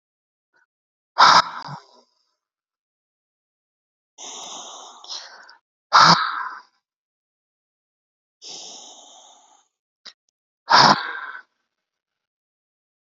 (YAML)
exhalation_length: 13.1 s
exhalation_amplitude: 31415
exhalation_signal_mean_std_ratio: 0.25
survey_phase: beta (2021-08-13 to 2022-03-07)
age: 45-64
gender: Male
wearing_mask: 'No'
symptom_cough_any: true
smoker_status: Ex-smoker
respiratory_condition_asthma: false
respiratory_condition_other: false
recruitment_source: REACT
submission_delay: 2 days
covid_test_result: Negative
covid_test_method: RT-qPCR
influenza_a_test_result: Negative
influenza_b_test_result: Negative